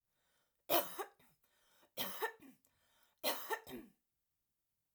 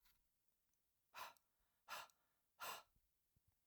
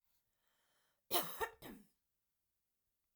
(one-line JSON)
{"three_cough_length": "4.9 s", "three_cough_amplitude": 3842, "three_cough_signal_mean_std_ratio": 0.34, "exhalation_length": "3.7 s", "exhalation_amplitude": 420, "exhalation_signal_mean_std_ratio": 0.35, "cough_length": "3.2 s", "cough_amplitude": 2875, "cough_signal_mean_std_ratio": 0.26, "survey_phase": "alpha (2021-03-01 to 2021-08-12)", "age": "45-64", "gender": "Female", "wearing_mask": "No", "symptom_none": true, "smoker_status": "Never smoked", "respiratory_condition_asthma": false, "respiratory_condition_other": false, "recruitment_source": "REACT", "submission_delay": "1 day", "covid_test_result": "Negative", "covid_test_method": "RT-qPCR"}